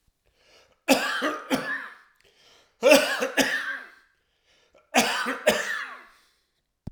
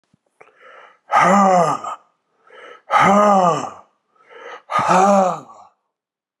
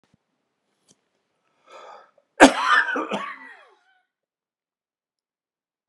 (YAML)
three_cough_length: 6.9 s
three_cough_amplitude: 24000
three_cough_signal_mean_std_ratio: 0.44
exhalation_length: 6.4 s
exhalation_amplitude: 28945
exhalation_signal_mean_std_ratio: 0.5
cough_length: 5.9 s
cough_amplitude: 32767
cough_signal_mean_std_ratio: 0.23
survey_phase: alpha (2021-03-01 to 2021-08-12)
age: 65+
gender: Male
wearing_mask: 'No'
symptom_cough_any: true
symptom_shortness_of_breath: true
symptom_fatigue: true
smoker_status: Never smoked
respiratory_condition_asthma: false
respiratory_condition_other: false
recruitment_source: Test and Trace
submission_delay: 2 days
covid_test_result: Positive
covid_test_method: RT-qPCR